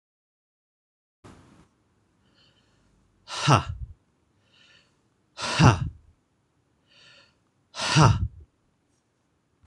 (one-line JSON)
{"exhalation_length": "9.7 s", "exhalation_amplitude": 26027, "exhalation_signal_mean_std_ratio": 0.26, "survey_phase": "beta (2021-08-13 to 2022-03-07)", "age": "45-64", "gender": "Male", "wearing_mask": "No", "symptom_cough_any": true, "symptom_sore_throat": true, "symptom_fatigue": true, "smoker_status": "Never smoked", "respiratory_condition_asthma": false, "respiratory_condition_other": false, "recruitment_source": "Test and Trace", "submission_delay": "2 days", "covid_test_result": "Positive", "covid_test_method": "RT-qPCR", "covid_ct_value": 18.4, "covid_ct_gene": "ORF1ab gene", "covid_ct_mean": 18.9, "covid_viral_load": "610000 copies/ml", "covid_viral_load_category": "Low viral load (10K-1M copies/ml)"}